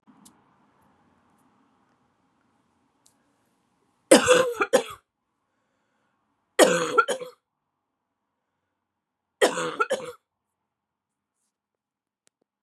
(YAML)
three_cough_length: 12.6 s
three_cough_amplitude: 31160
three_cough_signal_mean_std_ratio: 0.24
survey_phase: beta (2021-08-13 to 2022-03-07)
age: 45-64
gender: Female
wearing_mask: 'No'
symptom_cough_any: true
symptom_runny_or_blocked_nose: true
symptom_sore_throat: true
symptom_onset: 4 days
smoker_status: Prefer not to say
respiratory_condition_asthma: false
respiratory_condition_other: false
recruitment_source: Test and Trace
submission_delay: 2 days
covid_test_result: Negative
covid_test_method: RT-qPCR